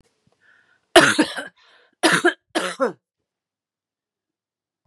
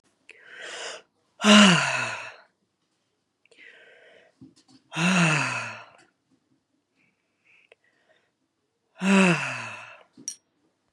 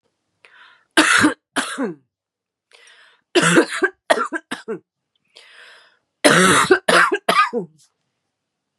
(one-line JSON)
{"cough_length": "4.9 s", "cough_amplitude": 32768, "cough_signal_mean_std_ratio": 0.3, "exhalation_length": "10.9 s", "exhalation_amplitude": 26082, "exhalation_signal_mean_std_ratio": 0.33, "three_cough_length": "8.8 s", "three_cough_amplitude": 32767, "three_cough_signal_mean_std_ratio": 0.42, "survey_phase": "beta (2021-08-13 to 2022-03-07)", "age": "45-64", "gender": "Female", "wearing_mask": "No", "symptom_cough_any": true, "symptom_runny_or_blocked_nose": true, "symptom_sore_throat": true, "symptom_fatigue": true, "symptom_headache": true, "symptom_onset": "7 days", "smoker_status": "Never smoked", "respiratory_condition_asthma": false, "respiratory_condition_other": false, "recruitment_source": "Test and Trace", "submission_delay": "2 days", "covid_test_result": "Positive", "covid_test_method": "RT-qPCR", "covid_ct_value": 17.7, "covid_ct_gene": "ORF1ab gene"}